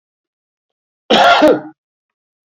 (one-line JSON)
{"cough_length": "2.6 s", "cough_amplitude": 30629, "cough_signal_mean_std_ratio": 0.37, "survey_phase": "beta (2021-08-13 to 2022-03-07)", "age": "65+", "gender": "Male", "wearing_mask": "No", "symptom_none": true, "smoker_status": "Ex-smoker", "respiratory_condition_asthma": false, "respiratory_condition_other": false, "recruitment_source": "REACT", "submission_delay": "3 days", "covid_test_result": "Negative", "covid_test_method": "RT-qPCR", "influenza_a_test_result": "Negative", "influenza_b_test_result": "Negative"}